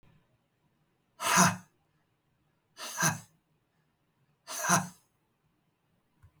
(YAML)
exhalation_length: 6.4 s
exhalation_amplitude: 12553
exhalation_signal_mean_std_ratio: 0.28
survey_phase: beta (2021-08-13 to 2022-03-07)
age: 45-64
gender: Male
wearing_mask: 'No'
symptom_none: true
smoker_status: Never smoked
respiratory_condition_asthma: false
respiratory_condition_other: false
recruitment_source: REACT
submission_delay: 5 days
covid_test_result: Negative
covid_test_method: RT-qPCR
influenza_a_test_result: Negative
influenza_b_test_result: Negative